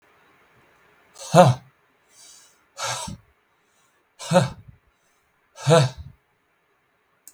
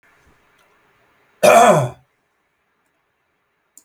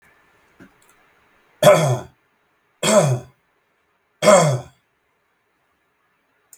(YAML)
exhalation_length: 7.3 s
exhalation_amplitude: 32768
exhalation_signal_mean_std_ratio: 0.27
cough_length: 3.8 s
cough_amplitude: 32768
cough_signal_mean_std_ratio: 0.28
three_cough_length: 6.6 s
three_cough_amplitude: 32768
three_cough_signal_mean_std_ratio: 0.32
survey_phase: beta (2021-08-13 to 2022-03-07)
age: 45-64
gender: Male
wearing_mask: 'No'
symptom_none: true
smoker_status: Never smoked
respiratory_condition_asthma: false
respiratory_condition_other: false
recruitment_source: REACT
submission_delay: 2 days
covid_test_result: Negative
covid_test_method: RT-qPCR
influenza_a_test_result: Negative
influenza_b_test_result: Negative